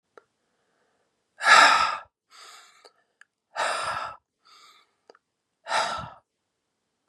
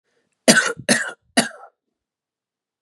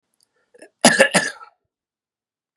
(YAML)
exhalation_length: 7.1 s
exhalation_amplitude: 24508
exhalation_signal_mean_std_ratio: 0.3
three_cough_length: 2.8 s
three_cough_amplitude: 32767
three_cough_signal_mean_std_ratio: 0.31
cough_length: 2.6 s
cough_amplitude: 32767
cough_signal_mean_std_ratio: 0.28
survey_phase: beta (2021-08-13 to 2022-03-07)
age: 45-64
gender: Male
wearing_mask: 'No'
symptom_cough_any: true
symptom_runny_or_blocked_nose: true
symptom_other: true
symptom_onset: 5 days
smoker_status: Never smoked
respiratory_condition_asthma: false
respiratory_condition_other: false
recruitment_source: Test and Trace
submission_delay: 1 day
covid_test_result: Positive
covid_test_method: RT-qPCR
covid_ct_value: 18.6
covid_ct_gene: ORF1ab gene
covid_ct_mean: 18.7
covid_viral_load: 760000 copies/ml
covid_viral_load_category: Low viral load (10K-1M copies/ml)